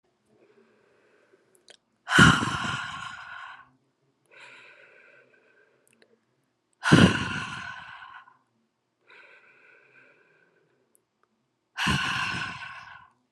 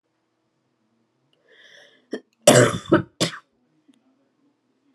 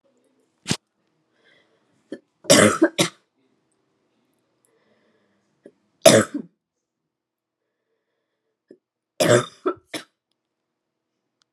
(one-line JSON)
{"exhalation_length": "13.3 s", "exhalation_amplitude": 25212, "exhalation_signal_mean_std_ratio": 0.29, "cough_length": "4.9 s", "cough_amplitude": 32768, "cough_signal_mean_std_ratio": 0.24, "three_cough_length": "11.5 s", "three_cough_amplitude": 32768, "three_cough_signal_mean_std_ratio": 0.22, "survey_phase": "alpha (2021-03-01 to 2021-08-12)", "age": "18-44", "gender": "Female", "wearing_mask": "No", "symptom_cough_any": true, "symptom_fatigue": true, "symptom_change_to_sense_of_smell_or_taste": true, "symptom_loss_of_taste": true, "symptom_onset": "7 days", "smoker_status": "Never smoked", "respiratory_condition_asthma": false, "respiratory_condition_other": false, "recruitment_source": "Test and Trace", "submission_delay": "1 day", "covid_test_result": "Positive", "covid_test_method": "RT-qPCR", "covid_ct_value": 23.3, "covid_ct_gene": "ORF1ab gene", "covid_ct_mean": 24.2, "covid_viral_load": "11000 copies/ml", "covid_viral_load_category": "Low viral load (10K-1M copies/ml)"}